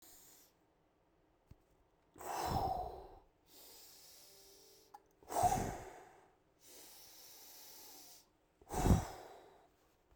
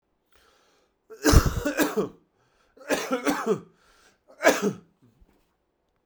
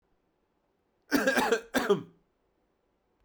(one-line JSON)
{"exhalation_length": "10.2 s", "exhalation_amplitude": 4497, "exhalation_signal_mean_std_ratio": 0.35, "three_cough_length": "6.1 s", "three_cough_amplitude": 24588, "three_cough_signal_mean_std_ratio": 0.37, "cough_length": "3.2 s", "cough_amplitude": 9289, "cough_signal_mean_std_ratio": 0.38, "survey_phase": "beta (2021-08-13 to 2022-03-07)", "age": "18-44", "gender": "Male", "wearing_mask": "No", "symptom_cough_any": true, "symptom_headache": true, "symptom_change_to_sense_of_smell_or_taste": true, "symptom_loss_of_taste": true, "symptom_onset": "50 days", "smoker_status": "Never smoked", "respiratory_condition_asthma": false, "respiratory_condition_other": false, "recruitment_source": "Test and Trace", "submission_delay": "42 days", "covid_test_result": "Negative", "covid_test_method": "RT-qPCR"}